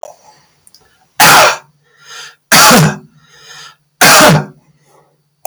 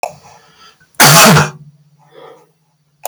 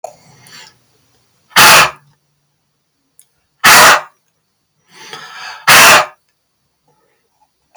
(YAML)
three_cough_length: 5.5 s
three_cough_amplitude: 32768
three_cough_signal_mean_std_ratio: 0.47
cough_length: 3.1 s
cough_amplitude: 32768
cough_signal_mean_std_ratio: 0.4
exhalation_length: 7.8 s
exhalation_amplitude: 32768
exhalation_signal_mean_std_ratio: 0.37
survey_phase: beta (2021-08-13 to 2022-03-07)
age: 45-64
gender: Male
wearing_mask: 'No'
symptom_none: true
smoker_status: Never smoked
respiratory_condition_asthma: false
respiratory_condition_other: false
recruitment_source: REACT
submission_delay: 3 days
covid_test_result: Negative
covid_test_method: RT-qPCR
influenza_a_test_result: Negative
influenza_b_test_result: Negative